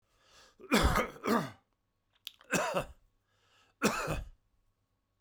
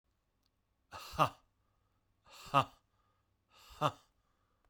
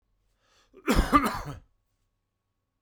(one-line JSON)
{"three_cough_length": "5.2 s", "three_cough_amplitude": 7677, "three_cough_signal_mean_std_ratio": 0.41, "exhalation_length": "4.7 s", "exhalation_amplitude": 6655, "exhalation_signal_mean_std_ratio": 0.22, "cough_length": "2.8 s", "cough_amplitude": 15881, "cough_signal_mean_std_ratio": 0.32, "survey_phase": "beta (2021-08-13 to 2022-03-07)", "age": "45-64", "gender": "Male", "wearing_mask": "No", "symptom_cough_any": true, "symptom_diarrhoea": true, "symptom_fatigue": true, "symptom_onset": "4 days", "smoker_status": "Never smoked", "respiratory_condition_asthma": false, "respiratory_condition_other": false, "recruitment_source": "Test and Trace", "submission_delay": "2 days", "covid_test_result": "Positive", "covid_test_method": "RT-qPCR", "covid_ct_value": 18.1, "covid_ct_gene": "ORF1ab gene", "covid_ct_mean": 18.7, "covid_viral_load": "720000 copies/ml", "covid_viral_load_category": "Low viral load (10K-1M copies/ml)"}